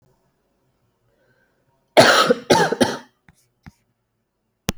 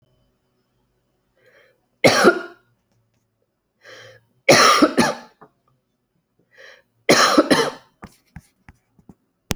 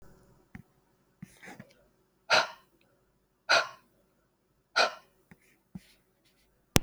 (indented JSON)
{
  "cough_length": "4.8 s",
  "cough_amplitude": 30192,
  "cough_signal_mean_std_ratio": 0.31,
  "three_cough_length": "9.6 s",
  "three_cough_amplitude": 28909,
  "three_cough_signal_mean_std_ratio": 0.32,
  "exhalation_length": "6.8 s",
  "exhalation_amplitude": 28306,
  "exhalation_signal_mean_std_ratio": 0.23,
  "survey_phase": "alpha (2021-03-01 to 2021-08-12)",
  "age": "45-64",
  "gender": "Female",
  "wearing_mask": "No",
  "symptom_new_continuous_cough": true,
  "symptom_fatigue": true,
  "symptom_loss_of_taste": true,
  "symptom_onset": "5 days",
  "smoker_status": "Never smoked",
  "respiratory_condition_asthma": false,
  "respiratory_condition_other": false,
  "recruitment_source": "Test and Trace",
  "submission_delay": "2 days",
  "covid_test_result": "Positive",
  "covid_test_method": "RT-qPCR",
  "covid_ct_value": 15.1,
  "covid_ct_gene": "ORF1ab gene",
  "covid_ct_mean": 15.8,
  "covid_viral_load": "6400000 copies/ml",
  "covid_viral_load_category": "High viral load (>1M copies/ml)"
}